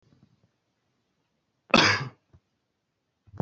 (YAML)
cough_length: 3.4 s
cough_amplitude: 24398
cough_signal_mean_std_ratio: 0.23
survey_phase: beta (2021-08-13 to 2022-03-07)
age: 18-44
gender: Male
wearing_mask: 'No'
symptom_none: true
smoker_status: Never smoked
respiratory_condition_asthma: false
respiratory_condition_other: false
recruitment_source: REACT
submission_delay: 1 day
covid_test_result: Negative
covid_test_method: RT-qPCR
influenza_a_test_result: Negative
influenza_b_test_result: Negative